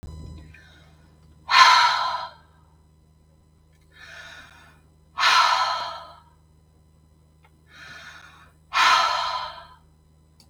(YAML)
exhalation_length: 10.5 s
exhalation_amplitude: 32189
exhalation_signal_mean_std_ratio: 0.38
survey_phase: beta (2021-08-13 to 2022-03-07)
age: 45-64
gender: Female
wearing_mask: 'No'
symptom_none: true
smoker_status: Never smoked
respiratory_condition_asthma: false
respiratory_condition_other: false
recruitment_source: REACT
submission_delay: 1 day
covid_test_result: Negative
covid_test_method: RT-qPCR
influenza_a_test_result: Negative
influenza_b_test_result: Negative